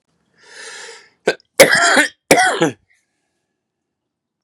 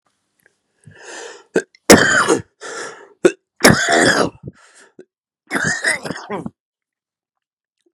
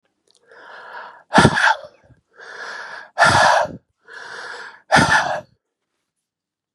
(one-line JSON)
{"cough_length": "4.4 s", "cough_amplitude": 32768, "cough_signal_mean_std_ratio": 0.36, "three_cough_length": "7.9 s", "three_cough_amplitude": 32768, "three_cough_signal_mean_std_ratio": 0.37, "exhalation_length": "6.7 s", "exhalation_amplitude": 32768, "exhalation_signal_mean_std_ratio": 0.41, "survey_phase": "beta (2021-08-13 to 2022-03-07)", "age": "18-44", "gender": "Male", "wearing_mask": "No", "symptom_cough_any": true, "symptom_shortness_of_breath": true, "symptom_onset": "12 days", "smoker_status": "Current smoker (11 or more cigarettes per day)", "respiratory_condition_asthma": false, "respiratory_condition_other": false, "recruitment_source": "REACT", "submission_delay": "3 days", "covid_test_result": "Negative", "covid_test_method": "RT-qPCR", "influenza_a_test_result": "Unknown/Void", "influenza_b_test_result": "Unknown/Void"}